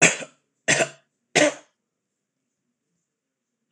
three_cough_length: 3.7 s
three_cough_amplitude: 26027
three_cough_signal_mean_std_ratio: 0.28
survey_phase: beta (2021-08-13 to 2022-03-07)
age: 65+
gender: Male
wearing_mask: 'No'
symptom_runny_or_blocked_nose: true
symptom_sore_throat: true
smoker_status: Never smoked
respiratory_condition_asthma: false
respiratory_condition_other: false
recruitment_source: Test and Trace
submission_delay: 1 day
covid_test_result: Negative
covid_test_method: RT-qPCR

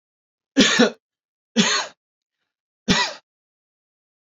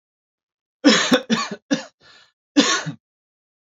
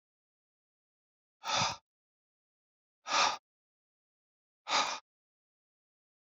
three_cough_length: 4.3 s
three_cough_amplitude: 27125
three_cough_signal_mean_std_ratio: 0.34
cough_length: 3.8 s
cough_amplitude: 27238
cough_signal_mean_std_ratio: 0.37
exhalation_length: 6.2 s
exhalation_amplitude: 5677
exhalation_signal_mean_std_ratio: 0.28
survey_phase: alpha (2021-03-01 to 2021-08-12)
age: 45-64
gender: Male
wearing_mask: 'No'
symptom_none: true
smoker_status: Ex-smoker
respiratory_condition_asthma: false
respiratory_condition_other: false
recruitment_source: REACT
submission_delay: 1 day
covid_test_result: Negative
covid_test_method: RT-qPCR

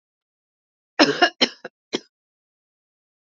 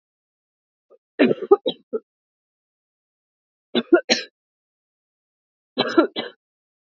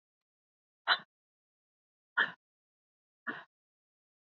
cough_length: 3.3 s
cough_amplitude: 29326
cough_signal_mean_std_ratio: 0.23
three_cough_length: 6.8 s
three_cough_amplitude: 27162
three_cough_signal_mean_std_ratio: 0.25
exhalation_length: 4.4 s
exhalation_amplitude: 6988
exhalation_signal_mean_std_ratio: 0.18
survey_phase: beta (2021-08-13 to 2022-03-07)
age: 45-64
gender: Female
wearing_mask: 'No'
symptom_runny_or_blocked_nose: true
symptom_change_to_sense_of_smell_or_taste: true
symptom_loss_of_taste: true
smoker_status: Never smoked
respiratory_condition_asthma: false
respiratory_condition_other: false
recruitment_source: Test and Trace
submission_delay: 2 days
covid_test_result: Negative
covid_test_method: ePCR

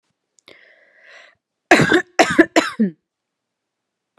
cough_length: 4.2 s
cough_amplitude: 32768
cough_signal_mean_std_ratio: 0.31
survey_phase: alpha (2021-03-01 to 2021-08-12)
age: 18-44
gender: Female
wearing_mask: 'No'
symptom_cough_any: true
symptom_fatigue: true
symptom_onset: 3 days
smoker_status: Ex-smoker
respiratory_condition_asthma: false
respiratory_condition_other: false
recruitment_source: Test and Trace
submission_delay: 2 days
covid_test_result: Positive
covid_test_method: RT-qPCR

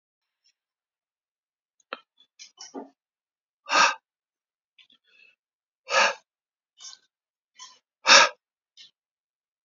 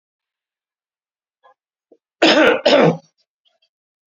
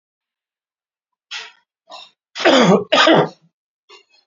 exhalation_length: 9.6 s
exhalation_amplitude: 27103
exhalation_signal_mean_std_ratio: 0.2
cough_length: 4.1 s
cough_amplitude: 28555
cough_signal_mean_std_ratio: 0.33
three_cough_length: 4.3 s
three_cough_amplitude: 29779
three_cough_signal_mean_std_ratio: 0.36
survey_phase: beta (2021-08-13 to 2022-03-07)
age: 45-64
gender: Male
wearing_mask: 'No'
symptom_none: true
smoker_status: Ex-smoker
respiratory_condition_asthma: false
respiratory_condition_other: false
recruitment_source: REACT
submission_delay: 1 day
covid_test_result: Negative
covid_test_method: RT-qPCR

